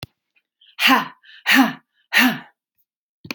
{"exhalation_length": "3.3 s", "exhalation_amplitude": 31893, "exhalation_signal_mean_std_ratio": 0.38, "survey_phase": "beta (2021-08-13 to 2022-03-07)", "age": "45-64", "gender": "Female", "wearing_mask": "No", "symptom_none": true, "smoker_status": "Never smoked", "respiratory_condition_asthma": false, "respiratory_condition_other": false, "recruitment_source": "REACT", "submission_delay": "1 day", "covid_test_result": "Negative", "covid_test_method": "RT-qPCR"}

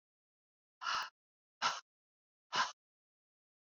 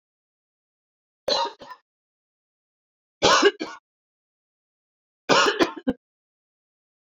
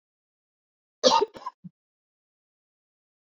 {"exhalation_length": "3.8 s", "exhalation_amplitude": 2834, "exhalation_signal_mean_std_ratio": 0.3, "three_cough_length": "7.2 s", "three_cough_amplitude": 22887, "three_cough_signal_mean_std_ratio": 0.29, "cough_length": "3.2 s", "cough_amplitude": 20621, "cough_signal_mean_std_ratio": 0.21, "survey_phase": "beta (2021-08-13 to 2022-03-07)", "age": "45-64", "gender": "Female", "wearing_mask": "No", "symptom_cough_any": true, "symptom_runny_or_blocked_nose": true, "symptom_onset": "5 days", "smoker_status": "Ex-smoker", "respiratory_condition_asthma": false, "respiratory_condition_other": false, "recruitment_source": "REACT", "submission_delay": "14 days", "covid_test_result": "Negative", "covid_test_method": "RT-qPCR"}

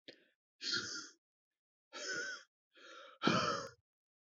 {"exhalation_length": "4.4 s", "exhalation_amplitude": 4347, "exhalation_signal_mean_std_ratio": 0.42, "survey_phase": "beta (2021-08-13 to 2022-03-07)", "age": "18-44", "gender": "Male", "wearing_mask": "No", "symptom_headache": true, "symptom_onset": "3 days", "smoker_status": "Never smoked", "respiratory_condition_asthma": false, "respiratory_condition_other": false, "recruitment_source": "REACT", "submission_delay": "2 days", "covid_test_result": "Negative", "covid_test_method": "RT-qPCR", "influenza_a_test_result": "Negative", "influenza_b_test_result": "Negative"}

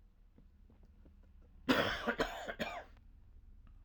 {"cough_length": "3.8 s", "cough_amplitude": 5701, "cough_signal_mean_std_ratio": 0.44, "survey_phase": "alpha (2021-03-01 to 2021-08-12)", "age": "65+", "gender": "Male", "wearing_mask": "No", "symptom_none": true, "symptom_onset": "5 days", "smoker_status": "Never smoked", "respiratory_condition_asthma": false, "respiratory_condition_other": false, "recruitment_source": "REACT", "submission_delay": "1 day", "covid_test_result": "Negative", "covid_test_method": "RT-qPCR"}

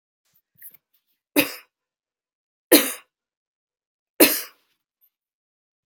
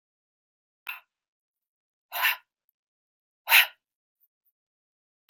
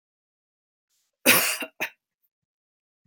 {"three_cough_length": "5.9 s", "three_cough_amplitude": 32768, "three_cough_signal_mean_std_ratio": 0.2, "exhalation_length": "5.3 s", "exhalation_amplitude": 20228, "exhalation_signal_mean_std_ratio": 0.19, "cough_length": "3.1 s", "cough_amplitude": 25534, "cough_signal_mean_std_ratio": 0.26, "survey_phase": "beta (2021-08-13 to 2022-03-07)", "age": "45-64", "gender": "Female", "wearing_mask": "No", "symptom_none": true, "symptom_onset": "12 days", "smoker_status": "Never smoked", "respiratory_condition_asthma": false, "respiratory_condition_other": false, "recruitment_source": "REACT", "submission_delay": "1 day", "covid_test_result": "Negative", "covid_test_method": "RT-qPCR", "influenza_a_test_result": "Negative", "influenza_b_test_result": "Negative"}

